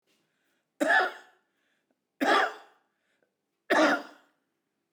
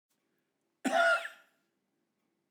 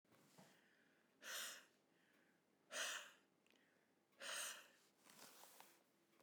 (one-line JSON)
{"three_cough_length": "4.9 s", "three_cough_amplitude": 10119, "three_cough_signal_mean_std_ratio": 0.36, "cough_length": "2.5 s", "cough_amplitude": 4950, "cough_signal_mean_std_ratio": 0.32, "exhalation_length": "6.2 s", "exhalation_amplitude": 493, "exhalation_signal_mean_std_ratio": 0.44, "survey_phase": "beta (2021-08-13 to 2022-03-07)", "age": "65+", "gender": "Male", "wearing_mask": "No", "symptom_cough_any": true, "symptom_runny_or_blocked_nose": true, "smoker_status": "Ex-smoker", "respiratory_condition_asthma": false, "respiratory_condition_other": false, "recruitment_source": "REACT", "submission_delay": "2 days", "covid_test_result": "Negative", "covid_test_method": "RT-qPCR", "influenza_a_test_result": "Negative", "influenza_b_test_result": "Negative"}